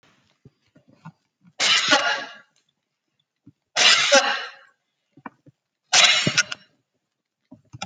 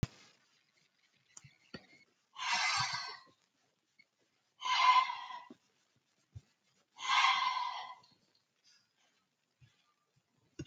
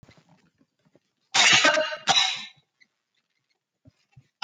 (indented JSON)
{
  "three_cough_length": "7.9 s",
  "three_cough_amplitude": 28621,
  "three_cough_signal_mean_std_ratio": 0.37,
  "exhalation_length": "10.7 s",
  "exhalation_amplitude": 6073,
  "exhalation_signal_mean_std_ratio": 0.35,
  "cough_length": "4.4 s",
  "cough_amplitude": 23798,
  "cough_signal_mean_std_ratio": 0.36,
  "survey_phase": "alpha (2021-03-01 to 2021-08-12)",
  "age": "65+",
  "gender": "Female",
  "wearing_mask": "No",
  "symptom_none": true,
  "smoker_status": "Never smoked",
  "respiratory_condition_asthma": false,
  "respiratory_condition_other": false,
  "recruitment_source": "REACT",
  "submission_delay": "2 days",
  "covid_test_result": "Negative",
  "covid_test_method": "RT-qPCR"
}